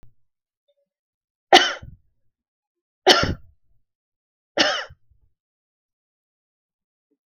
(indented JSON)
{
  "three_cough_length": "7.3 s",
  "three_cough_amplitude": 32768,
  "three_cough_signal_mean_std_ratio": 0.22,
  "survey_phase": "beta (2021-08-13 to 2022-03-07)",
  "age": "45-64",
  "gender": "Female",
  "wearing_mask": "No",
  "symptom_none": true,
  "smoker_status": "Never smoked",
  "respiratory_condition_asthma": false,
  "respiratory_condition_other": false,
  "recruitment_source": "REACT",
  "submission_delay": "2 days",
  "covid_test_result": "Negative",
  "covid_test_method": "RT-qPCR"
}